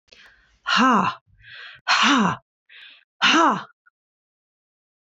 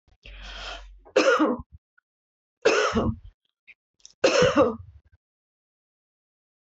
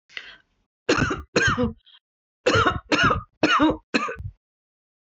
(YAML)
exhalation_length: 5.1 s
exhalation_amplitude: 18425
exhalation_signal_mean_std_ratio: 0.44
three_cough_length: 6.7 s
three_cough_amplitude: 14201
three_cough_signal_mean_std_ratio: 0.4
cough_length: 5.1 s
cough_amplitude: 18419
cough_signal_mean_std_ratio: 0.5
survey_phase: beta (2021-08-13 to 2022-03-07)
age: 45-64
gender: Female
wearing_mask: 'No'
symptom_none: true
smoker_status: Never smoked
respiratory_condition_asthma: false
respiratory_condition_other: false
recruitment_source: REACT
submission_delay: 1 day
covid_test_result: Negative
covid_test_method: RT-qPCR